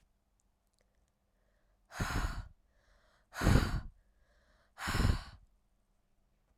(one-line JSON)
{"exhalation_length": "6.6 s", "exhalation_amplitude": 8462, "exhalation_signal_mean_std_ratio": 0.33, "survey_phase": "alpha (2021-03-01 to 2021-08-12)", "age": "18-44", "gender": "Female", "wearing_mask": "No", "symptom_cough_any": true, "symptom_fatigue": true, "symptom_headache": true, "symptom_onset": "6 days", "smoker_status": "Never smoked", "respiratory_condition_asthma": false, "respiratory_condition_other": false, "recruitment_source": "Test and Trace", "submission_delay": "2 days", "covid_test_result": "Positive", "covid_test_method": "RT-qPCR", "covid_ct_value": 16.1, "covid_ct_gene": "ORF1ab gene", "covid_ct_mean": 17.5, "covid_viral_load": "1800000 copies/ml", "covid_viral_load_category": "High viral load (>1M copies/ml)"}